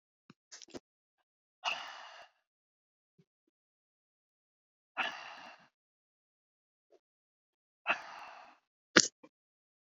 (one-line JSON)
{"exhalation_length": "9.9 s", "exhalation_amplitude": 29892, "exhalation_signal_mean_std_ratio": 0.17, "survey_phase": "beta (2021-08-13 to 2022-03-07)", "age": "65+", "gender": "Female", "wearing_mask": "No", "symptom_cough_any": true, "symptom_runny_or_blocked_nose": true, "symptom_fatigue": true, "symptom_onset": "10 days", "smoker_status": "Never smoked", "respiratory_condition_asthma": true, "respiratory_condition_other": false, "recruitment_source": "REACT", "submission_delay": "2 days", "covid_test_result": "Negative", "covid_test_method": "RT-qPCR"}